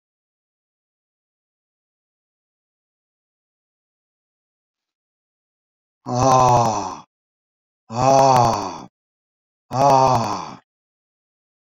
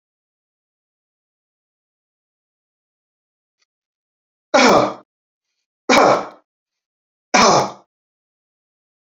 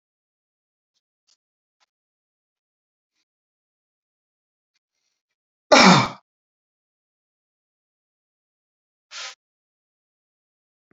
{"exhalation_length": "11.7 s", "exhalation_amplitude": 28321, "exhalation_signal_mean_std_ratio": 0.34, "three_cough_length": "9.1 s", "three_cough_amplitude": 29585, "three_cough_signal_mean_std_ratio": 0.27, "cough_length": "10.9 s", "cough_amplitude": 30939, "cough_signal_mean_std_ratio": 0.14, "survey_phase": "beta (2021-08-13 to 2022-03-07)", "age": "65+", "gender": "Male", "wearing_mask": "No", "symptom_none": true, "smoker_status": "Never smoked", "respiratory_condition_asthma": false, "respiratory_condition_other": false, "recruitment_source": "REACT", "submission_delay": "1 day", "covid_test_result": "Negative", "covid_test_method": "RT-qPCR"}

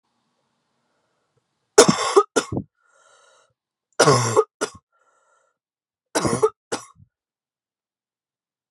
{"three_cough_length": "8.7 s", "three_cough_amplitude": 32768, "three_cough_signal_mean_std_ratio": 0.27, "survey_phase": "beta (2021-08-13 to 2022-03-07)", "age": "18-44", "gender": "Female", "wearing_mask": "No", "symptom_cough_any": true, "symptom_new_continuous_cough": true, "symptom_runny_or_blocked_nose": true, "symptom_sore_throat": true, "symptom_abdominal_pain": true, "symptom_fever_high_temperature": true, "symptom_headache": true, "symptom_change_to_sense_of_smell_or_taste": true, "symptom_loss_of_taste": true, "symptom_onset": "4 days", "smoker_status": "Never smoked", "respiratory_condition_asthma": false, "respiratory_condition_other": false, "recruitment_source": "Test and Trace", "submission_delay": "2 days", "covid_test_result": "Positive", "covid_test_method": "RT-qPCR", "covid_ct_value": 15.1, "covid_ct_gene": "ORF1ab gene", "covid_ct_mean": 15.4, "covid_viral_load": "9200000 copies/ml", "covid_viral_load_category": "High viral load (>1M copies/ml)"}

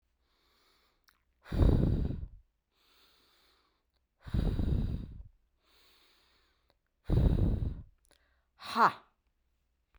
{"exhalation_length": "10.0 s", "exhalation_amplitude": 8969, "exhalation_signal_mean_std_ratio": 0.38, "survey_phase": "beta (2021-08-13 to 2022-03-07)", "age": "45-64", "gender": "Female", "wearing_mask": "No", "symptom_sore_throat": true, "smoker_status": "Never smoked", "respiratory_condition_asthma": false, "respiratory_condition_other": false, "recruitment_source": "REACT", "submission_delay": "5 days", "covid_test_result": "Negative", "covid_test_method": "RT-qPCR"}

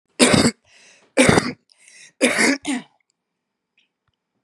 {"three_cough_length": "4.4 s", "three_cough_amplitude": 32767, "three_cough_signal_mean_std_ratio": 0.39, "survey_phase": "beta (2021-08-13 to 2022-03-07)", "age": "45-64", "gender": "Female", "wearing_mask": "No", "symptom_cough_any": true, "symptom_runny_or_blocked_nose": true, "symptom_abdominal_pain": true, "symptom_diarrhoea": true, "symptom_headache": true, "symptom_other": true, "smoker_status": "Ex-smoker", "respiratory_condition_asthma": false, "respiratory_condition_other": false, "recruitment_source": "Test and Trace", "submission_delay": "2 days", "covid_test_result": "Positive", "covid_test_method": "RT-qPCR", "covid_ct_value": 19.3, "covid_ct_gene": "ORF1ab gene"}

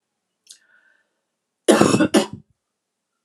{"cough_length": "3.2 s", "cough_amplitude": 32768, "cough_signal_mean_std_ratio": 0.31, "survey_phase": "beta (2021-08-13 to 2022-03-07)", "age": "45-64", "gender": "Female", "wearing_mask": "No", "symptom_none": true, "smoker_status": "Ex-smoker", "respiratory_condition_asthma": false, "respiratory_condition_other": false, "recruitment_source": "REACT", "submission_delay": "1 day", "covid_test_method": "RT-qPCR"}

